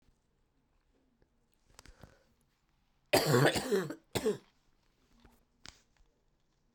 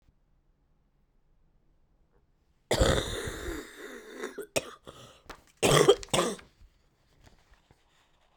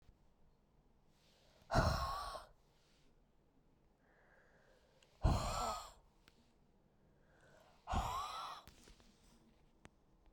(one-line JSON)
{"three_cough_length": "6.7 s", "three_cough_amplitude": 7084, "three_cough_signal_mean_std_ratio": 0.29, "cough_length": "8.4 s", "cough_amplitude": 16220, "cough_signal_mean_std_ratio": 0.32, "exhalation_length": "10.3 s", "exhalation_amplitude": 3187, "exhalation_signal_mean_std_ratio": 0.35, "survey_phase": "beta (2021-08-13 to 2022-03-07)", "age": "18-44", "gender": "Female", "wearing_mask": "No", "symptom_cough_any": true, "symptom_runny_or_blocked_nose": true, "symptom_fatigue": true, "symptom_fever_high_temperature": true, "symptom_headache": true, "symptom_change_to_sense_of_smell_or_taste": true, "symptom_onset": "4 days", "smoker_status": "Ex-smoker", "respiratory_condition_asthma": true, "respiratory_condition_other": false, "recruitment_source": "Test and Trace", "submission_delay": "2 days", "covid_test_result": "Positive", "covid_test_method": "RT-qPCR", "covid_ct_value": 15.4, "covid_ct_gene": "ORF1ab gene", "covid_ct_mean": 16.6, "covid_viral_load": "3600000 copies/ml", "covid_viral_load_category": "High viral load (>1M copies/ml)"}